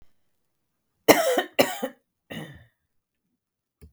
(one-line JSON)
{"cough_length": "3.9 s", "cough_amplitude": 32768, "cough_signal_mean_std_ratio": 0.27, "survey_phase": "beta (2021-08-13 to 2022-03-07)", "age": "45-64", "gender": "Female", "wearing_mask": "No", "symptom_none": true, "smoker_status": "Ex-smoker", "respiratory_condition_asthma": true, "respiratory_condition_other": false, "recruitment_source": "REACT", "submission_delay": "3 days", "covid_test_result": "Negative", "covid_test_method": "RT-qPCR", "influenza_a_test_result": "Negative", "influenza_b_test_result": "Negative"}